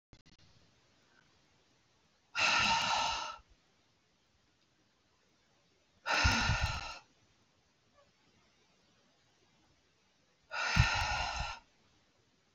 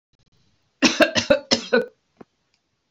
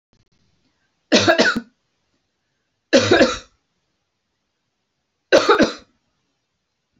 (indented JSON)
{
  "exhalation_length": "12.5 s",
  "exhalation_amplitude": 7467,
  "exhalation_signal_mean_std_ratio": 0.38,
  "cough_length": "2.9 s",
  "cough_amplitude": 29117,
  "cough_signal_mean_std_ratio": 0.35,
  "three_cough_length": "7.0 s",
  "three_cough_amplitude": 30404,
  "three_cough_signal_mean_std_ratio": 0.32,
  "survey_phase": "beta (2021-08-13 to 2022-03-07)",
  "age": "45-64",
  "gender": "Female",
  "wearing_mask": "No",
  "symptom_none": true,
  "smoker_status": "Never smoked",
  "respiratory_condition_asthma": false,
  "respiratory_condition_other": false,
  "recruitment_source": "REACT",
  "submission_delay": "2 days",
  "covid_test_result": "Negative",
  "covid_test_method": "RT-qPCR",
  "influenza_a_test_result": "Negative",
  "influenza_b_test_result": "Negative"
}